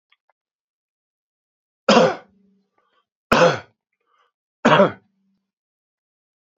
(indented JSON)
{
  "three_cough_length": "6.6 s",
  "three_cough_amplitude": 28327,
  "three_cough_signal_mean_std_ratio": 0.26,
  "survey_phase": "beta (2021-08-13 to 2022-03-07)",
  "age": "65+",
  "gender": "Male",
  "wearing_mask": "No",
  "symptom_runny_or_blocked_nose": true,
  "symptom_headache": true,
  "symptom_change_to_sense_of_smell_or_taste": true,
  "symptom_other": true,
  "symptom_onset": "5 days",
  "smoker_status": "Never smoked",
  "respiratory_condition_asthma": false,
  "respiratory_condition_other": false,
  "recruitment_source": "Test and Trace",
  "submission_delay": "2 days",
  "covid_test_result": "Positive",
  "covid_test_method": "RT-qPCR",
  "covid_ct_value": 14.5,
  "covid_ct_gene": "N gene",
  "covid_ct_mean": 14.6,
  "covid_viral_load": "16000000 copies/ml",
  "covid_viral_load_category": "High viral load (>1M copies/ml)"
}